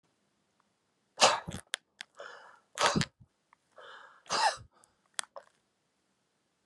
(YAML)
exhalation_length: 6.7 s
exhalation_amplitude: 12872
exhalation_signal_mean_std_ratio: 0.27
survey_phase: beta (2021-08-13 to 2022-03-07)
age: 65+
gender: Male
wearing_mask: 'No'
symptom_none: true
smoker_status: Never smoked
respiratory_condition_asthma: false
respiratory_condition_other: false
recruitment_source: REACT
submission_delay: 2 days
covid_test_result: Negative
covid_test_method: RT-qPCR
influenza_a_test_result: Negative
influenza_b_test_result: Negative